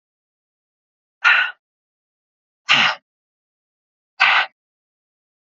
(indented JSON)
{
  "exhalation_length": "5.5 s",
  "exhalation_amplitude": 30297,
  "exhalation_signal_mean_std_ratio": 0.29,
  "survey_phase": "beta (2021-08-13 to 2022-03-07)",
  "age": "45-64",
  "gender": "Female",
  "wearing_mask": "No",
  "symptom_cough_any": true,
  "symptom_runny_or_blocked_nose": true,
  "symptom_sore_throat": true,
  "symptom_abdominal_pain": true,
  "symptom_fatigue": true,
  "symptom_headache": true,
  "symptom_change_to_sense_of_smell_or_taste": true,
  "smoker_status": "Never smoked",
  "respiratory_condition_asthma": false,
  "respiratory_condition_other": false,
  "recruitment_source": "Test and Trace",
  "submission_delay": "1 day",
  "covid_test_result": "Positive",
  "covid_test_method": "RT-qPCR",
  "covid_ct_value": 18.2,
  "covid_ct_gene": "S gene",
  "covid_ct_mean": 19.5,
  "covid_viral_load": "390000 copies/ml",
  "covid_viral_load_category": "Low viral load (10K-1M copies/ml)"
}